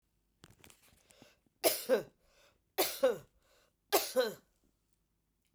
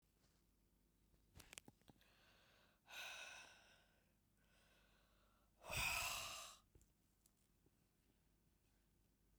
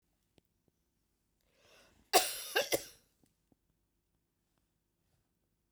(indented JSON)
{
  "three_cough_length": "5.5 s",
  "three_cough_amplitude": 7612,
  "three_cough_signal_mean_std_ratio": 0.33,
  "exhalation_length": "9.4 s",
  "exhalation_amplitude": 805,
  "exhalation_signal_mean_std_ratio": 0.35,
  "cough_length": "5.7 s",
  "cough_amplitude": 8837,
  "cough_signal_mean_std_ratio": 0.2,
  "survey_phase": "beta (2021-08-13 to 2022-03-07)",
  "age": "45-64",
  "gender": "Female",
  "wearing_mask": "No",
  "symptom_none": true,
  "smoker_status": "Never smoked",
  "respiratory_condition_asthma": false,
  "respiratory_condition_other": false,
  "recruitment_source": "REACT",
  "submission_delay": "1 day",
  "covid_test_result": "Negative",
  "covid_test_method": "RT-qPCR"
}